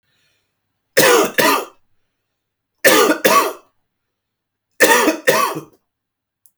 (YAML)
three_cough_length: 6.6 s
three_cough_amplitude: 32768
three_cough_signal_mean_std_ratio: 0.43
survey_phase: beta (2021-08-13 to 2022-03-07)
age: 45-64
gender: Female
wearing_mask: 'No'
symptom_none: true
smoker_status: Never smoked
respiratory_condition_asthma: false
respiratory_condition_other: false
recruitment_source: Test and Trace
submission_delay: -4 days
covid_test_result: Negative
covid_test_method: LFT